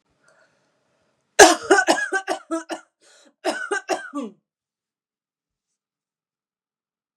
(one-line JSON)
{"cough_length": "7.2 s", "cough_amplitude": 32768, "cough_signal_mean_std_ratio": 0.27, "survey_phase": "beta (2021-08-13 to 2022-03-07)", "age": "45-64", "gender": "Female", "wearing_mask": "No", "symptom_none": true, "smoker_status": "Ex-smoker", "respiratory_condition_asthma": false, "respiratory_condition_other": false, "recruitment_source": "REACT", "submission_delay": "2 days", "covid_test_result": "Negative", "covid_test_method": "RT-qPCR", "influenza_a_test_result": "Negative", "influenza_b_test_result": "Negative"}